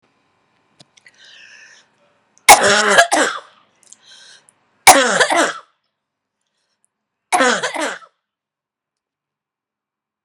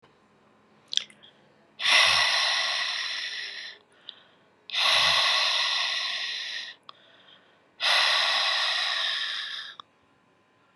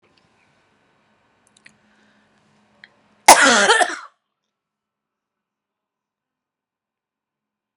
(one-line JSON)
{"three_cough_length": "10.2 s", "three_cough_amplitude": 32768, "three_cough_signal_mean_std_ratio": 0.32, "exhalation_length": "10.8 s", "exhalation_amplitude": 19520, "exhalation_signal_mean_std_ratio": 0.62, "cough_length": "7.8 s", "cough_amplitude": 32768, "cough_signal_mean_std_ratio": 0.21, "survey_phase": "beta (2021-08-13 to 2022-03-07)", "age": "45-64", "gender": "Female", "wearing_mask": "No", "symptom_cough_any": true, "symptom_runny_or_blocked_nose": true, "symptom_diarrhoea": true, "symptom_fatigue": true, "smoker_status": "Ex-smoker", "respiratory_condition_asthma": false, "respiratory_condition_other": true, "recruitment_source": "Test and Trace", "submission_delay": "2 days", "covid_test_result": "Positive", "covid_test_method": "LFT"}